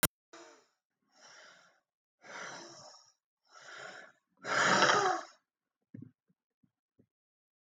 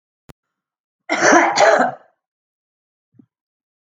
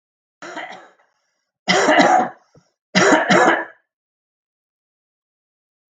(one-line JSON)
{"exhalation_length": "7.7 s", "exhalation_amplitude": 10089, "exhalation_signal_mean_std_ratio": 0.3, "cough_length": "3.9 s", "cough_amplitude": 32483, "cough_signal_mean_std_ratio": 0.36, "three_cough_length": "6.0 s", "three_cough_amplitude": 32767, "three_cough_signal_mean_std_ratio": 0.39, "survey_phase": "alpha (2021-03-01 to 2021-08-12)", "age": "65+", "gender": "Male", "wearing_mask": "No", "symptom_cough_any": true, "symptom_onset": "9 days", "smoker_status": "Ex-smoker", "respiratory_condition_asthma": false, "respiratory_condition_other": false, "recruitment_source": "REACT", "submission_delay": "2 days", "covid_test_result": "Negative", "covid_test_method": "RT-qPCR"}